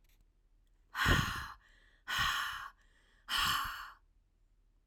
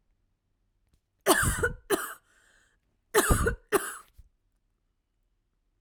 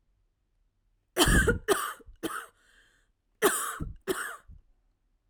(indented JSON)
{
  "exhalation_length": "4.9 s",
  "exhalation_amplitude": 6179,
  "exhalation_signal_mean_std_ratio": 0.47,
  "three_cough_length": "5.8 s",
  "three_cough_amplitude": 16348,
  "three_cough_signal_mean_std_ratio": 0.35,
  "cough_length": "5.3 s",
  "cough_amplitude": 12303,
  "cough_signal_mean_std_ratio": 0.39,
  "survey_phase": "alpha (2021-03-01 to 2021-08-12)",
  "age": "45-64",
  "gender": "Female",
  "wearing_mask": "No",
  "symptom_cough_any": true,
  "smoker_status": "Ex-smoker",
  "respiratory_condition_asthma": false,
  "respiratory_condition_other": false,
  "recruitment_source": "REACT",
  "submission_delay": "2 days",
  "covid_test_result": "Negative",
  "covid_test_method": "RT-qPCR"
}